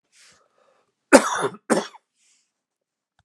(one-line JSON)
{"cough_length": "3.2 s", "cough_amplitude": 32768, "cough_signal_mean_std_ratio": 0.23, "survey_phase": "beta (2021-08-13 to 2022-03-07)", "age": "65+", "gender": "Male", "wearing_mask": "No", "symptom_cough_any": true, "smoker_status": "Never smoked", "respiratory_condition_asthma": false, "respiratory_condition_other": false, "recruitment_source": "REACT", "submission_delay": "2 days", "covid_test_result": "Negative", "covid_test_method": "RT-qPCR"}